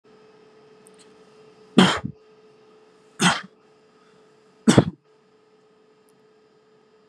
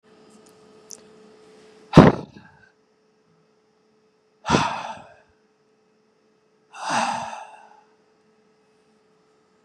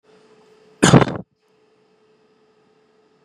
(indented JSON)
{
  "three_cough_length": "7.1 s",
  "three_cough_amplitude": 32767,
  "three_cough_signal_mean_std_ratio": 0.23,
  "exhalation_length": "9.6 s",
  "exhalation_amplitude": 32768,
  "exhalation_signal_mean_std_ratio": 0.21,
  "cough_length": "3.2 s",
  "cough_amplitude": 32768,
  "cough_signal_mean_std_ratio": 0.22,
  "survey_phase": "beta (2021-08-13 to 2022-03-07)",
  "age": "18-44",
  "gender": "Male",
  "wearing_mask": "No",
  "symptom_none": true,
  "smoker_status": "Never smoked",
  "respiratory_condition_asthma": false,
  "respiratory_condition_other": false,
  "recruitment_source": "REACT",
  "submission_delay": "2 days",
  "covid_test_result": "Negative",
  "covid_test_method": "RT-qPCR",
  "influenza_a_test_result": "Negative",
  "influenza_b_test_result": "Negative"
}